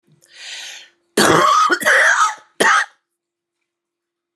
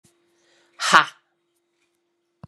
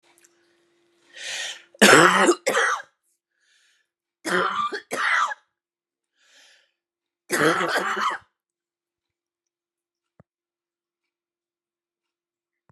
{"cough_length": "4.4 s", "cough_amplitude": 31373, "cough_signal_mean_std_ratio": 0.51, "exhalation_length": "2.5 s", "exhalation_amplitude": 32768, "exhalation_signal_mean_std_ratio": 0.2, "three_cough_length": "12.7 s", "three_cough_amplitude": 32722, "three_cough_signal_mean_std_ratio": 0.33, "survey_phase": "beta (2021-08-13 to 2022-03-07)", "age": "45-64", "gender": "Female", "wearing_mask": "No", "symptom_cough_any": true, "symptom_runny_or_blocked_nose": true, "symptom_shortness_of_breath": true, "symptom_diarrhoea": true, "symptom_fatigue": true, "symptom_fever_high_temperature": true, "symptom_headache": true, "symptom_change_to_sense_of_smell_or_taste": true, "symptom_loss_of_taste": true, "symptom_other": true, "symptom_onset": "3 days", "smoker_status": "Ex-smoker", "respiratory_condition_asthma": false, "respiratory_condition_other": false, "recruitment_source": "Test and Trace", "submission_delay": "1 day", "covid_test_result": "Positive", "covid_test_method": "RT-qPCR", "covid_ct_value": 14.8, "covid_ct_gene": "ORF1ab gene", "covid_ct_mean": 15.0, "covid_viral_load": "12000000 copies/ml", "covid_viral_load_category": "High viral load (>1M copies/ml)"}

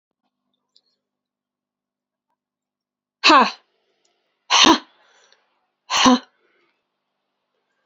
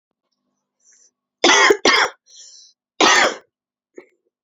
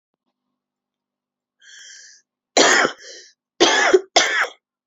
{"exhalation_length": "7.9 s", "exhalation_amplitude": 31196, "exhalation_signal_mean_std_ratio": 0.25, "cough_length": "4.4 s", "cough_amplitude": 29483, "cough_signal_mean_std_ratio": 0.37, "three_cough_length": "4.9 s", "three_cough_amplitude": 30484, "three_cough_signal_mean_std_ratio": 0.38, "survey_phase": "beta (2021-08-13 to 2022-03-07)", "age": "45-64", "gender": "Female", "wearing_mask": "No", "symptom_cough_any": true, "symptom_shortness_of_breath": true, "symptom_diarrhoea": true, "symptom_fatigue": true, "symptom_fever_high_temperature": true, "symptom_headache": true, "smoker_status": "Never smoked", "respiratory_condition_asthma": true, "respiratory_condition_other": false, "recruitment_source": "Test and Trace", "submission_delay": "2 days", "covid_test_result": "Positive", "covid_test_method": "ePCR"}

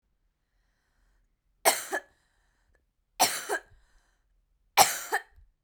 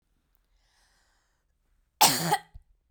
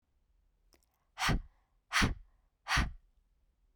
{"three_cough_length": "5.6 s", "three_cough_amplitude": 20805, "three_cough_signal_mean_std_ratio": 0.26, "cough_length": "2.9 s", "cough_amplitude": 20680, "cough_signal_mean_std_ratio": 0.26, "exhalation_length": "3.8 s", "exhalation_amplitude": 4659, "exhalation_signal_mean_std_ratio": 0.35, "survey_phase": "beta (2021-08-13 to 2022-03-07)", "age": "18-44", "gender": "Female", "wearing_mask": "No", "symptom_none": true, "smoker_status": "Never smoked", "respiratory_condition_asthma": false, "respiratory_condition_other": false, "recruitment_source": "REACT", "submission_delay": "1 day", "covid_test_result": "Negative", "covid_test_method": "RT-qPCR"}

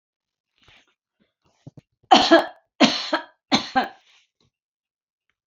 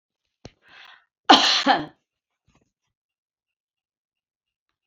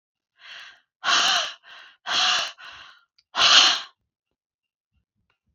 {"three_cough_length": "5.5 s", "three_cough_amplitude": 27356, "three_cough_signal_mean_std_ratio": 0.28, "cough_length": "4.9 s", "cough_amplitude": 27312, "cough_signal_mean_std_ratio": 0.23, "exhalation_length": "5.5 s", "exhalation_amplitude": 29787, "exhalation_signal_mean_std_ratio": 0.39, "survey_phase": "beta (2021-08-13 to 2022-03-07)", "age": "65+", "gender": "Female", "wearing_mask": "No", "symptom_none": true, "smoker_status": "Never smoked", "respiratory_condition_asthma": false, "respiratory_condition_other": false, "recruitment_source": "REACT", "submission_delay": "1 day", "covid_test_result": "Negative", "covid_test_method": "RT-qPCR"}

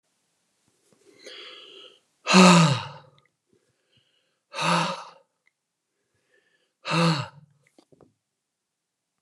{"exhalation_length": "9.2 s", "exhalation_amplitude": 27724, "exhalation_signal_mean_std_ratio": 0.28, "survey_phase": "beta (2021-08-13 to 2022-03-07)", "age": "45-64", "gender": "Male", "wearing_mask": "No", "symptom_none": true, "smoker_status": "Never smoked", "respiratory_condition_asthma": false, "respiratory_condition_other": false, "recruitment_source": "REACT", "submission_delay": "4 days", "covid_test_result": "Negative", "covid_test_method": "RT-qPCR", "influenza_a_test_result": "Negative", "influenza_b_test_result": "Negative"}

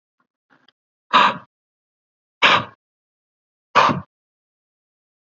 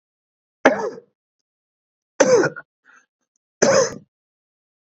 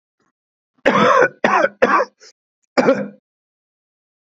{"exhalation_length": "5.3 s", "exhalation_amplitude": 32711, "exhalation_signal_mean_std_ratio": 0.27, "three_cough_length": "4.9 s", "three_cough_amplitude": 29275, "three_cough_signal_mean_std_ratio": 0.32, "cough_length": "4.3 s", "cough_amplitude": 32767, "cough_signal_mean_std_ratio": 0.42, "survey_phase": "beta (2021-08-13 to 2022-03-07)", "age": "45-64", "gender": "Male", "wearing_mask": "No", "symptom_cough_any": true, "symptom_runny_or_blocked_nose": true, "symptom_shortness_of_breath": true, "symptom_sore_throat": true, "symptom_fatigue": true, "symptom_fever_high_temperature": true, "symptom_headache": true, "symptom_change_to_sense_of_smell_or_taste": true, "symptom_onset": "2 days", "smoker_status": "Current smoker (e-cigarettes or vapes only)", "respiratory_condition_asthma": false, "respiratory_condition_other": false, "recruitment_source": "Test and Trace", "submission_delay": "2 days", "covid_test_result": "Positive", "covid_test_method": "ePCR"}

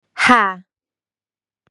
{"exhalation_length": "1.7 s", "exhalation_amplitude": 32767, "exhalation_signal_mean_std_ratio": 0.34, "survey_phase": "beta (2021-08-13 to 2022-03-07)", "age": "18-44", "gender": "Female", "wearing_mask": "No", "symptom_runny_or_blocked_nose": true, "symptom_sore_throat": true, "symptom_fatigue": true, "smoker_status": "Never smoked", "respiratory_condition_asthma": true, "respiratory_condition_other": false, "recruitment_source": "Test and Trace", "submission_delay": "2 days", "covid_test_result": "Positive", "covid_test_method": "RT-qPCR", "covid_ct_value": 22.5, "covid_ct_gene": "ORF1ab gene", "covid_ct_mean": 22.7, "covid_viral_load": "35000 copies/ml", "covid_viral_load_category": "Low viral load (10K-1M copies/ml)"}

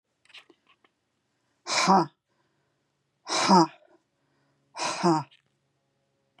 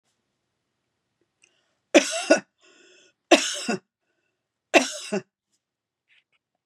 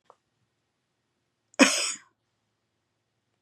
{"exhalation_length": "6.4 s", "exhalation_amplitude": 19305, "exhalation_signal_mean_std_ratio": 0.31, "three_cough_length": "6.7 s", "three_cough_amplitude": 28900, "three_cough_signal_mean_std_ratio": 0.24, "cough_length": "3.4 s", "cough_amplitude": 27648, "cough_signal_mean_std_ratio": 0.2, "survey_phase": "beta (2021-08-13 to 2022-03-07)", "age": "65+", "gender": "Female", "wearing_mask": "No", "symptom_abdominal_pain": true, "symptom_fatigue": true, "symptom_onset": "11 days", "smoker_status": "Never smoked", "respiratory_condition_asthma": false, "respiratory_condition_other": false, "recruitment_source": "REACT", "submission_delay": "-2 days", "covid_test_result": "Negative", "covid_test_method": "RT-qPCR", "influenza_a_test_result": "Negative", "influenza_b_test_result": "Negative"}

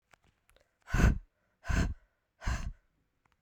{"exhalation_length": "3.4 s", "exhalation_amplitude": 9664, "exhalation_signal_mean_std_ratio": 0.35, "survey_phase": "beta (2021-08-13 to 2022-03-07)", "age": "18-44", "gender": "Female", "wearing_mask": "No", "symptom_cough_any": true, "symptom_runny_or_blocked_nose": true, "symptom_sore_throat": true, "symptom_fatigue": true, "symptom_fever_high_temperature": true, "symptom_headache": true, "symptom_change_to_sense_of_smell_or_taste": true, "symptom_onset": "2 days", "smoker_status": "Ex-smoker", "respiratory_condition_asthma": false, "respiratory_condition_other": false, "recruitment_source": "Test and Trace", "submission_delay": "2 days", "covid_test_result": "Positive", "covid_test_method": "RT-qPCR", "covid_ct_value": 17.3, "covid_ct_gene": "ORF1ab gene", "covid_ct_mean": 17.7, "covid_viral_load": "1600000 copies/ml", "covid_viral_load_category": "High viral load (>1M copies/ml)"}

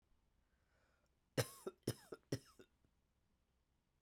{"three_cough_length": "4.0 s", "three_cough_amplitude": 2078, "three_cough_signal_mean_std_ratio": 0.22, "survey_phase": "beta (2021-08-13 to 2022-03-07)", "age": "45-64", "gender": "Female", "wearing_mask": "No", "symptom_cough_any": true, "symptom_runny_or_blocked_nose": true, "symptom_shortness_of_breath": true, "symptom_sore_throat": true, "symptom_headache": true, "symptom_other": true, "symptom_onset": "4 days", "smoker_status": "Never smoked", "respiratory_condition_asthma": false, "respiratory_condition_other": false, "recruitment_source": "Test and Trace", "submission_delay": "1 day", "covid_test_result": "Positive", "covid_test_method": "RT-qPCR", "covid_ct_value": 20.2, "covid_ct_gene": "ORF1ab gene", "covid_ct_mean": 20.6, "covid_viral_load": "170000 copies/ml", "covid_viral_load_category": "Low viral load (10K-1M copies/ml)"}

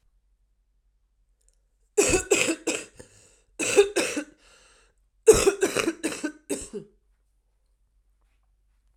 {"cough_length": "9.0 s", "cough_amplitude": 24595, "cough_signal_mean_std_ratio": 0.33, "survey_phase": "alpha (2021-03-01 to 2021-08-12)", "age": "18-44", "gender": "Female", "wearing_mask": "No", "symptom_cough_any": true, "symptom_change_to_sense_of_smell_or_taste": true, "symptom_loss_of_taste": true, "smoker_status": "Never smoked", "respiratory_condition_asthma": false, "respiratory_condition_other": false, "recruitment_source": "Test and Trace", "submission_delay": "1 day", "covid_test_result": "Positive", "covid_test_method": "RT-qPCR"}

